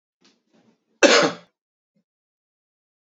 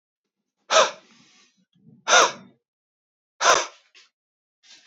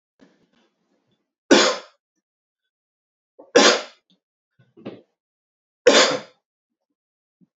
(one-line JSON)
{"cough_length": "3.2 s", "cough_amplitude": 28903, "cough_signal_mean_std_ratio": 0.23, "exhalation_length": "4.9 s", "exhalation_amplitude": 25385, "exhalation_signal_mean_std_ratio": 0.29, "three_cough_length": "7.6 s", "three_cough_amplitude": 31227, "three_cough_signal_mean_std_ratio": 0.25, "survey_phase": "beta (2021-08-13 to 2022-03-07)", "age": "45-64", "gender": "Male", "wearing_mask": "No", "symptom_cough_any": true, "symptom_runny_or_blocked_nose": true, "symptom_sore_throat": true, "symptom_fatigue": true, "smoker_status": "Never smoked", "respiratory_condition_asthma": false, "respiratory_condition_other": false, "recruitment_source": "Test and Trace", "submission_delay": "0 days", "covid_test_result": "Negative", "covid_test_method": "LFT"}